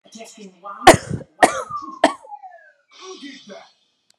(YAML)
three_cough_length: 4.2 s
three_cough_amplitude: 32768
three_cough_signal_mean_std_ratio: 0.26
survey_phase: beta (2021-08-13 to 2022-03-07)
age: 18-44
gender: Female
wearing_mask: 'No'
symptom_runny_or_blocked_nose: true
smoker_status: Never smoked
respiratory_condition_asthma: false
respiratory_condition_other: false
recruitment_source: REACT
submission_delay: 2 days
covid_test_result: Negative
covid_test_method: RT-qPCR